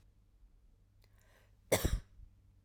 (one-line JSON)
{"cough_length": "2.6 s", "cough_amplitude": 5529, "cough_signal_mean_std_ratio": 0.28, "survey_phase": "alpha (2021-03-01 to 2021-08-12)", "age": "18-44", "gender": "Female", "wearing_mask": "No", "symptom_none": true, "smoker_status": "Never smoked", "respiratory_condition_asthma": false, "respiratory_condition_other": false, "recruitment_source": "REACT", "submission_delay": "1 day", "covid_test_result": "Negative", "covid_test_method": "RT-qPCR"}